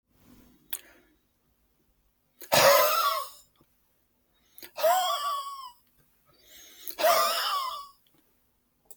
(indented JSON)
{
  "exhalation_length": "9.0 s",
  "exhalation_amplitude": 15745,
  "exhalation_signal_mean_std_ratio": 0.41,
  "survey_phase": "beta (2021-08-13 to 2022-03-07)",
  "age": "45-64",
  "gender": "Male",
  "wearing_mask": "No",
  "symptom_none": true,
  "symptom_onset": "7 days",
  "smoker_status": "Never smoked",
  "respiratory_condition_asthma": false,
  "respiratory_condition_other": false,
  "recruitment_source": "REACT",
  "submission_delay": "2 days",
  "covid_test_result": "Negative",
  "covid_test_method": "RT-qPCR",
  "influenza_a_test_result": "Negative",
  "influenza_b_test_result": "Negative"
}